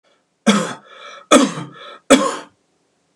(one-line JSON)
{"three_cough_length": "3.2 s", "three_cough_amplitude": 32768, "three_cough_signal_mean_std_ratio": 0.37, "survey_phase": "beta (2021-08-13 to 2022-03-07)", "age": "65+", "gender": "Male", "wearing_mask": "No", "symptom_none": true, "smoker_status": "Never smoked", "respiratory_condition_asthma": false, "respiratory_condition_other": false, "recruitment_source": "REACT", "submission_delay": "5 days", "covid_test_result": "Negative", "covid_test_method": "RT-qPCR", "influenza_a_test_result": "Negative", "influenza_b_test_result": "Negative"}